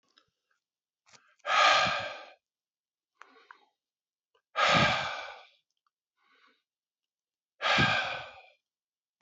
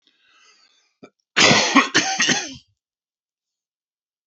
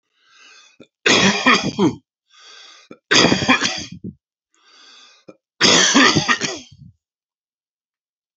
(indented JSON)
{
  "exhalation_length": "9.2 s",
  "exhalation_amplitude": 9826,
  "exhalation_signal_mean_std_ratio": 0.36,
  "cough_length": "4.3 s",
  "cough_amplitude": 29241,
  "cough_signal_mean_std_ratio": 0.36,
  "three_cough_length": "8.4 s",
  "three_cough_amplitude": 31343,
  "three_cough_signal_mean_std_ratio": 0.43,
  "survey_phase": "beta (2021-08-13 to 2022-03-07)",
  "age": "65+",
  "gender": "Male",
  "wearing_mask": "No",
  "symptom_cough_any": true,
  "symptom_runny_or_blocked_nose": true,
  "symptom_shortness_of_breath": true,
  "symptom_sore_throat": true,
  "symptom_fatigue": true,
  "symptom_fever_high_temperature": true,
  "symptom_headache": true,
  "symptom_onset": "6 days",
  "smoker_status": "Never smoked",
  "respiratory_condition_asthma": false,
  "respiratory_condition_other": false,
  "recruitment_source": "Test and Trace",
  "submission_delay": "2 days",
  "covid_test_result": "Positive",
  "covid_test_method": "RT-qPCR",
  "covid_ct_value": 14.7,
  "covid_ct_gene": "ORF1ab gene",
  "covid_ct_mean": 15.6,
  "covid_viral_load": "7600000 copies/ml",
  "covid_viral_load_category": "High viral load (>1M copies/ml)"
}